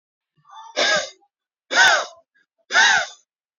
{
  "exhalation_length": "3.6 s",
  "exhalation_amplitude": 25614,
  "exhalation_signal_mean_std_ratio": 0.43,
  "survey_phase": "beta (2021-08-13 to 2022-03-07)",
  "age": "18-44",
  "gender": "Male",
  "wearing_mask": "No",
  "symptom_none": true,
  "symptom_onset": "12 days",
  "smoker_status": "Ex-smoker",
  "respiratory_condition_asthma": false,
  "respiratory_condition_other": false,
  "recruitment_source": "REACT",
  "submission_delay": "1 day",
  "covid_test_result": "Negative",
  "covid_test_method": "RT-qPCR",
  "influenza_a_test_result": "Negative",
  "influenza_b_test_result": "Negative"
}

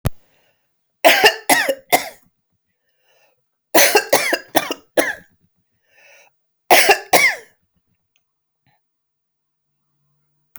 {
  "three_cough_length": "10.6 s",
  "three_cough_amplitude": 32768,
  "three_cough_signal_mean_std_ratio": 0.33,
  "survey_phase": "alpha (2021-03-01 to 2021-08-12)",
  "age": "45-64",
  "gender": "Female",
  "wearing_mask": "No",
  "symptom_none": true,
  "smoker_status": "Ex-smoker",
  "respiratory_condition_asthma": false,
  "respiratory_condition_other": false,
  "recruitment_source": "REACT",
  "submission_delay": "1 day",
  "covid_test_result": "Negative",
  "covid_test_method": "RT-qPCR"
}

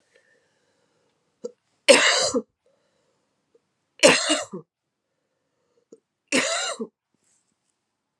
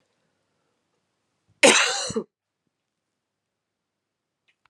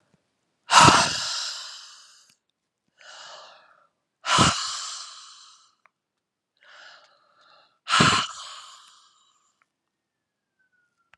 {
  "three_cough_length": "8.2 s",
  "three_cough_amplitude": 31098,
  "three_cough_signal_mean_std_ratio": 0.29,
  "cough_length": "4.7 s",
  "cough_amplitude": 28914,
  "cough_signal_mean_std_ratio": 0.22,
  "exhalation_length": "11.2 s",
  "exhalation_amplitude": 30636,
  "exhalation_signal_mean_std_ratio": 0.3,
  "survey_phase": "beta (2021-08-13 to 2022-03-07)",
  "age": "45-64",
  "gender": "Female",
  "wearing_mask": "No",
  "symptom_cough_any": true,
  "symptom_runny_or_blocked_nose": true,
  "symptom_sore_throat": true,
  "symptom_diarrhoea": true,
  "symptom_fever_high_temperature": true,
  "symptom_headache": true,
  "symptom_onset": "3 days",
  "smoker_status": "Never smoked",
  "respiratory_condition_asthma": true,
  "respiratory_condition_other": false,
  "recruitment_source": "Test and Trace",
  "submission_delay": "2 days",
  "covid_test_result": "Positive",
  "covid_test_method": "RT-qPCR",
  "covid_ct_value": 13.0,
  "covid_ct_gene": "ORF1ab gene",
  "covid_ct_mean": 13.4,
  "covid_viral_load": "41000000 copies/ml",
  "covid_viral_load_category": "High viral load (>1M copies/ml)"
}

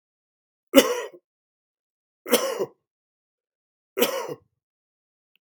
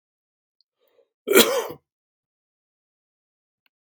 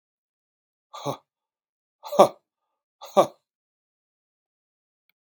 {
  "three_cough_length": "5.6 s",
  "three_cough_amplitude": 32768,
  "three_cough_signal_mean_std_ratio": 0.26,
  "cough_length": "3.8 s",
  "cough_amplitude": 32767,
  "cough_signal_mean_std_ratio": 0.22,
  "exhalation_length": "5.3 s",
  "exhalation_amplitude": 32723,
  "exhalation_signal_mean_std_ratio": 0.16,
  "survey_phase": "beta (2021-08-13 to 2022-03-07)",
  "age": "65+",
  "gender": "Male",
  "wearing_mask": "No",
  "symptom_none": true,
  "smoker_status": "Ex-smoker",
  "respiratory_condition_asthma": false,
  "respiratory_condition_other": false,
  "recruitment_source": "REACT",
  "submission_delay": "5 days",
  "covid_test_result": "Negative",
  "covid_test_method": "RT-qPCR",
  "influenza_a_test_result": "Negative",
  "influenza_b_test_result": "Negative"
}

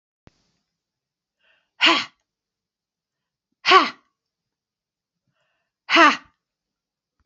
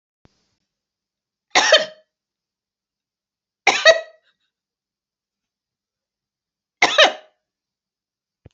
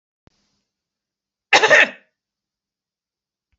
{
  "exhalation_length": "7.3 s",
  "exhalation_amplitude": 29755,
  "exhalation_signal_mean_std_ratio": 0.23,
  "three_cough_length": "8.5 s",
  "three_cough_amplitude": 30584,
  "three_cough_signal_mean_std_ratio": 0.23,
  "cough_length": "3.6 s",
  "cough_amplitude": 31474,
  "cough_signal_mean_std_ratio": 0.23,
  "survey_phase": "beta (2021-08-13 to 2022-03-07)",
  "age": "45-64",
  "gender": "Female",
  "wearing_mask": "No",
  "symptom_none": true,
  "smoker_status": "Never smoked",
  "respiratory_condition_asthma": false,
  "respiratory_condition_other": false,
  "recruitment_source": "REACT",
  "submission_delay": "1 day",
  "covid_test_result": "Negative",
  "covid_test_method": "RT-qPCR"
}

